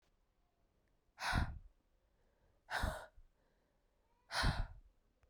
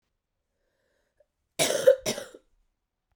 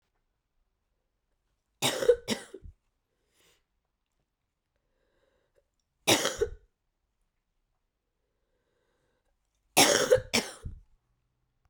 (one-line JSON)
{"exhalation_length": "5.3 s", "exhalation_amplitude": 2277, "exhalation_signal_mean_std_ratio": 0.36, "cough_length": "3.2 s", "cough_amplitude": 16281, "cough_signal_mean_std_ratio": 0.26, "three_cough_length": "11.7 s", "three_cough_amplitude": 17084, "three_cough_signal_mean_std_ratio": 0.24, "survey_phase": "beta (2021-08-13 to 2022-03-07)", "age": "18-44", "gender": "Female", "wearing_mask": "No", "symptom_cough_any": true, "symptom_runny_or_blocked_nose": true, "symptom_shortness_of_breath": true, "symptom_fatigue": true, "symptom_headache": true, "symptom_change_to_sense_of_smell_or_taste": true, "symptom_other": true, "symptom_onset": "3 days", "smoker_status": "Never smoked", "respiratory_condition_asthma": false, "respiratory_condition_other": false, "recruitment_source": "Test and Trace", "submission_delay": "2 days", "covid_test_result": "Positive", "covid_test_method": "RT-qPCR"}